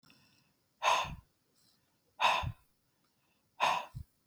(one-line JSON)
{"exhalation_length": "4.3 s", "exhalation_amplitude": 6257, "exhalation_signal_mean_std_ratio": 0.36, "survey_phase": "beta (2021-08-13 to 2022-03-07)", "age": "45-64", "gender": "Female", "wearing_mask": "No", "symptom_none": true, "smoker_status": "Ex-smoker", "respiratory_condition_asthma": false, "respiratory_condition_other": false, "recruitment_source": "REACT", "submission_delay": "3 days", "covid_test_result": "Negative", "covid_test_method": "RT-qPCR", "influenza_a_test_result": "Unknown/Void", "influenza_b_test_result": "Unknown/Void"}